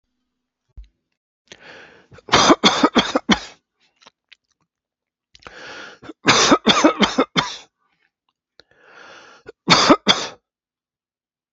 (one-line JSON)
{"three_cough_length": "11.5 s", "three_cough_amplitude": 32278, "three_cough_signal_mean_std_ratio": 0.34, "survey_phase": "beta (2021-08-13 to 2022-03-07)", "age": "65+", "gender": "Male", "wearing_mask": "No", "symptom_cough_any": true, "symptom_runny_or_blocked_nose": true, "symptom_fatigue": true, "symptom_change_to_sense_of_smell_or_taste": true, "symptom_other": true, "smoker_status": "Never smoked", "respiratory_condition_asthma": false, "respiratory_condition_other": false, "recruitment_source": "Test and Trace", "submission_delay": "1 day", "covid_test_result": "Positive", "covid_test_method": "RT-qPCR", "covid_ct_value": 24.8, "covid_ct_gene": "ORF1ab gene", "covid_ct_mean": 25.1, "covid_viral_load": "6000 copies/ml", "covid_viral_load_category": "Minimal viral load (< 10K copies/ml)"}